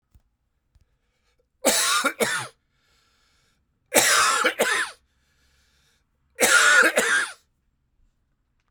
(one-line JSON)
{"three_cough_length": "8.7 s", "three_cough_amplitude": 32767, "three_cough_signal_mean_std_ratio": 0.43, "survey_phase": "alpha (2021-03-01 to 2021-08-12)", "age": "45-64", "gender": "Male", "wearing_mask": "No", "symptom_cough_any": true, "symptom_fever_high_temperature": true, "symptom_headache": true, "symptom_onset": "4 days", "smoker_status": "Ex-smoker", "respiratory_condition_asthma": false, "respiratory_condition_other": false, "recruitment_source": "Test and Trace", "submission_delay": "1 day", "covid_test_result": "Positive", "covid_test_method": "RT-qPCR", "covid_ct_value": 15.8, "covid_ct_gene": "ORF1ab gene", "covid_ct_mean": 16.4, "covid_viral_load": "4200000 copies/ml", "covid_viral_load_category": "High viral load (>1M copies/ml)"}